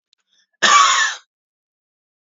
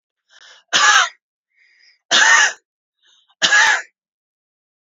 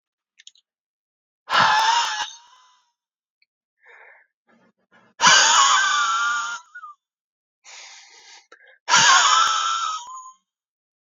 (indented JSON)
{
  "cough_length": "2.2 s",
  "cough_amplitude": 30081,
  "cough_signal_mean_std_ratio": 0.39,
  "three_cough_length": "4.9 s",
  "three_cough_amplitude": 32423,
  "three_cough_signal_mean_std_ratio": 0.41,
  "exhalation_length": "11.1 s",
  "exhalation_amplitude": 30068,
  "exhalation_signal_mean_std_ratio": 0.45,
  "survey_phase": "beta (2021-08-13 to 2022-03-07)",
  "age": "18-44",
  "gender": "Male",
  "wearing_mask": "No",
  "symptom_none": true,
  "smoker_status": "Never smoked",
  "respiratory_condition_asthma": true,
  "respiratory_condition_other": false,
  "recruitment_source": "REACT",
  "submission_delay": "1 day",
  "covid_test_result": "Negative",
  "covid_test_method": "RT-qPCR",
  "influenza_a_test_result": "Negative",
  "influenza_b_test_result": "Negative"
}